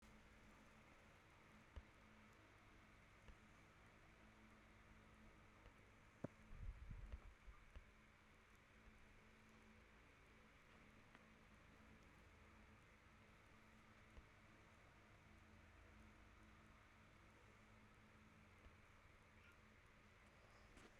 {
  "exhalation_length": "21.0 s",
  "exhalation_amplitude": 567,
  "exhalation_signal_mean_std_ratio": 0.84,
  "survey_phase": "beta (2021-08-13 to 2022-03-07)",
  "age": "18-44",
  "gender": "Female",
  "wearing_mask": "No",
  "symptom_cough_any": true,
  "symptom_runny_or_blocked_nose": true,
  "symptom_abdominal_pain": true,
  "symptom_fatigue": true,
  "symptom_headache": true,
  "symptom_change_to_sense_of_smell_or_taste": true,
  "symptom_loss_of_taste": true,
  "symptom_other": true,
  "symptom_onset": "3 days",
  "smoker_status": "Current smoker (1 to 10 cigarettes per day)",
  "respiratory_condition_asthma": false,
  "respiratory_condition_other": false,
  "recruitment_source": "Test and Trace",
  "submission_delay": "2 days",
  "covid_test_result": "Positive",
  "covid_test_method": "RT-qPCR",
  "covid_ct_value": 19.3,
  "covid_ct_gene": "ORF1ab gene",
  "covid_ct_mean": 19.6,
  "covid_viral_load": "360000 copies/ml",
  "covid_viral_load_category": "Low viral load (10K-1M copies/ml)"
}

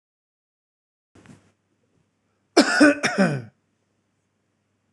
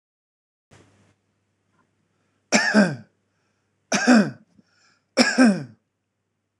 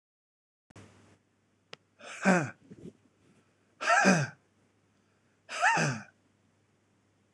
{
  "cough_length": "4.9 s",
  "cough_amplitude": 25599,
  "cough_signal_mean_std_ratio": 0.28,
  "three_cough_length": "6.6 s",
  "three_cough_amplitude": 25577,
  "three_cough_signal_mean_std_ratio": 0.33,
  "exhalation_length": "7.3 s",
  "exhalation_amplitude": 12847,
  "exhalation_signal_mean_std_ratio": 0.33,
  "survey_phase": "beta (2021-08-13 to 2022-03-07)",
  "age": "45-64",
  "gender": "Male",
  "wearing_mask": "No",
  "symptom_none": true,
  "smoker_status": "Ex-smoker",
  "respiratory_condition_asthma": false,
  "respiratory_condition_other": false,
  "recruitment_source": "REACT",
  "submission_delay": "2 days",
  "covid_test_result": "Negative",
  "covid_test_method": "RT-qPCR",
  "influenza_a_test_result": "Negative",
  "influenza_b_test_result": "Negative"
}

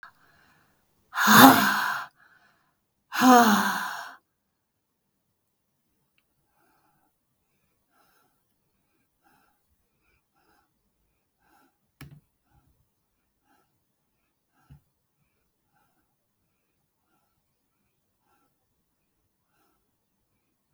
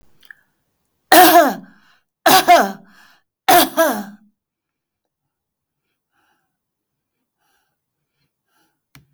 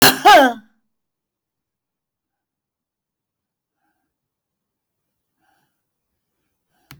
{
  "exhalation_length": "20.7 s",
  "exhalation_amplitude": 32766,
  "exhalation_signal_mean_std_ratio": 0.19,
  "three_cough_length": "9.1 s",
  "three_cough_amplitude": 32768,
  "three_cough_signal_mean_std_ratio": 0.3,
  "cough_length": "7.0 s",
  "cough_amplitude": 31806,
  "cough_signal_mean_std_ratio": 0.2,
  "survey_phase": "beta (2021-08-13 to 2022-03-07)",
  "age": "65+",
  "gender": "Female",
  "wearing_mask": "Yes",
  "symptom_none": true,
  "smoker_status": "Never smoked",
  "respiratory_condition_asthma": false,
  "respiratory_condition_other": false,
  "recruitment_source": "REACT",
  "submission_delay": "2 days",
  "covid_test_result": "Negative",
  "covid_test_method": "RT-qPCR",
  "influenza_a_test_result": "Negative",
  "influenza_b_test_result": "Negative"
}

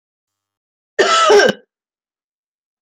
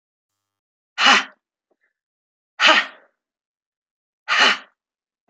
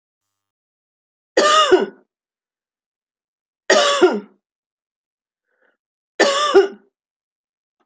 {
  "cough_length": "2.8 s",
  "cough_amplitude": 28890,
  "cough_signal_mean_std_ratio": 0.36,
  "exhalation_length": "5.3 s",
  "exhalation_amplitude": 31707,
  "exhalation_signal_mean_std_ratio": 0.29,
  "three_cough_length": "7.9 s",
  "three_cough_amplitude": 28197,
  "three_cough_signal_mean_std_ratio": 0.34,
  "survey_phase": "alpha (2021-03-01 to 2021-08-12)",
  "age": "65+",
  "gender": "Female",
  "wearing_mask": "No",
  "symptom_none": true,
  "smoker_status": "Never smoked",
  "respiratory_condition_asthma": true,
  "respiratory_condition_other": false,
  "recruitment_source": "REACT",
  "submission_delay": "1 day",
  "covid_test_result": "Negative",
  "covid_test_method": "RT-qPCR"
}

